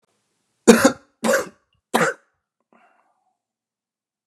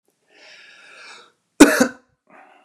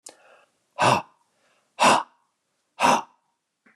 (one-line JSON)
{"three_cough_length": "4.3 s", "three_cough_amplitude": 32768, "three_cough_signal_mean_std_ratio": 0.26, "cough_length": "2.6 s", "cough_amplitude": 32768, "cough_signal_mean_std_ratio": 0.23, "exhalation_length": "3.8 s", "exhalation_amplitude": 19196, "exhalation_signal_mean_std_ratio": 0.34, "survey_phase": "beta (2021-08-13 to 2022-03-07)", "age": "45-64", "gender": "Male", "wearing_mask": "No", "symptom_none": true, "symptom_onset": "7 days", "smoker_status": "Never smoked", "respiratory_condition_asthma": false, "respiratory_condition_other": false, "recruitment_source": "REACT", "submission_delay": "2 days", "covid_test_result": "Negative", "covid_test_method": "RT-qPCR", "influenza_a_test_result": "Negative", "influenza_b_test_result": "Negative"}